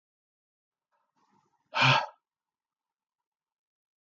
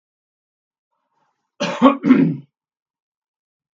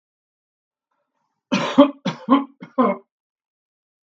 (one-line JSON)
{"exhalation_length": "4.1 s", "exhalation_amplitude": 9148, "exhalation_signal_mean_std_ratio": 0.21, "cough_length": "3.8 s", "cough_amplitude": 32768, "cough_signal_mean_std_ratio": 0.3, "three_cough_length": "4.1 s", "three_cough_amplitude": 32768, "three_cough_signal_mean_std_ratio": 0.31, "survey_phase": "beta (2021-08-13 to 2022-03-07)", "age": "65+", "gender": "Male", "wearing_mask": "No", "symptom_none": true, "smoker_status": "Never smoked", "respiratory_condition_asthma": false, "respiratory_condition_other": false, "recruitment_source": "REACT", "submission_delay": "1 day", "covid_test_result": "Negative", "covid_test_method": "RT-qPCR", "influenza_a_test_result": "Negative", "influenza_b_test_result": "Negative"}